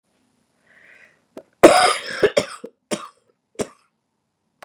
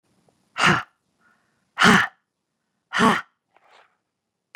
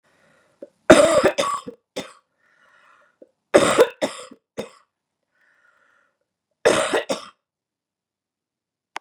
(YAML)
cough_length: 4.6 s
cough_amplitude: 32768
cough_signal_mean_std_ratio: 0.26
exhalation_length: 4.6 s
exhalation_amplitude: 25763
exhalation_signal_mean_std_ratio: 0.31
three_cough_length: 9.0 s
three_cough_amplitude: 32768
three_cough_signal_mean_std_ratio: 0.29
survey_phase: beta (2021-08-13 to 2022-03-07)
age: 65+
gender: Female
wearing_mask: 'No'
symptom_cough_any: true
symptom_sore_throat: true
symptom_other: true
smoker_status: Never smoked
respiratory_condition_asthma: false
respiratory_condition_other: false
recruitment_source: Test and Trace
submission_delay: 5 days
covid_test_result: Negative
covid_test_method: RT-qPCR